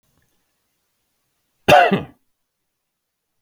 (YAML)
cough_length: 3.4 s
cough_amplitude: 32766
cough_signal_mean_std_ratio: 0.23
survey_phase: beta (2021-08-13 to 2022-03-07)
age: 65+
gender: Male
wearing_mask: 'No'
symptom_none: true
smoker_status: Never smoked
respiratory_condition_asthma: false
respiratory_condition_other: false
recruitment_source: REACT
submission_delay: 1 day
covid_test_result: Negative
covid_test_method: RT-qPCR